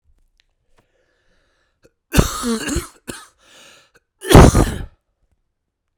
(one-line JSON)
{"three_cough_length": "6.0 s", "three_cough_amplitude": 32768, "three_cough_signal_mean_std_ratio": 0.27, "survey_phase": "beta (2021-08-13 to 2022-03-07)", "age": "45-64", "gender": "Male", "wearing_mask": "No", "symptom_cough_any": true, "symptom_runny_or_blocked_nose": true, "symptom_fatigue": true, "symptom_fever_high_temperature": true, "symptom_change_to_sense_of_smell_or_taste": true, "symptom_loss_of_taste": true, "symptom_onset": "3 days", "smoker_status": "Ex-smoker", "respiratory_condition_asthma": false, "respiratory_condition_other": false, "recruitment_source": "Test and Trace", "submission_delay": "2 days", "covid_test_result": "Positive", "covid_test_method": "RT-qPCR", "covid_ct_value": 16.2, "covid_ct_gene": "ORF1ab gene", "covid_ct_mean": 16.6, "covid_viral_load": "3500000 copies/ml", "covid_viral_load_category": "High viral load (>1M copies/ml)"}